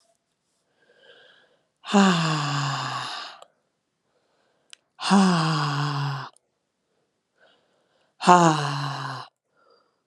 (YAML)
exhalation_length: 10.1 s
exhalation_amplitude: 32616
exhalation_signal_mean_std_ratio: 0.42
survey_phase: alpha (2021-03-01 to 2021-08-12)
age: 18-44
gender: Female
wearing_mask: 'No'
symptom_cough_any: true
symptom_diarrhoea: true
symptom_headache: true
symptom_change_to_sense_of_smell_or_taste: true
symptom_loss_of_taste: true
symptom_onset: 12 days
smoker_status: Ex-smoker
respiratory_condition_asthma: false
respiratory_condition_other: false
recruitment_source: Test and Trace
submission_delay: 2 days
covid_test_result: Positive
covid_test_method: RT-qPCR
covid_ct_value: 17.2
covid_ct_gene: N gene
covid_ct_mean: 18.0
covid_viral_load: 1300000 copies/ml
covid_viral_load_category: High viral load (>1M copies/ml)